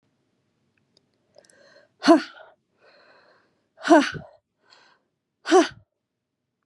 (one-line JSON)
{"exhalation_length": "6.7 s", "exhalation_amplitude": 25527, "exhalation_signal_mean_std_ratio": 0.23, "survey_phase": "beta (2021-08-13 to 2022-03-07)", "age": "18-44", "gender": "Female", "wearing_mask": "No", "symptom_runny_or_blocked_nose": true, "symptom_sore_throat": true, "symptom_fatigue": true, "symptom_headache": true, "symptom_other": true, "symptom_onset": "7 days", "smoker_status": "Never smoked", "respiratory_condition_asthma": false, "respiratory_condition_other": false, "recruitment_source": "Test and Trace", "submission_delay": "1 day", "covid_test_result": "Positive", "covid_test_method": "RT-qPCR", "covid_ct_value": 13.8, "covid_ct_gene": "ORF1ab gene", "covid_ct_mean": 14.1, "covid_viral_load": "25000000 copies/ml", "covid_viral_load_category": "High viral load (>1M copies/ml)"}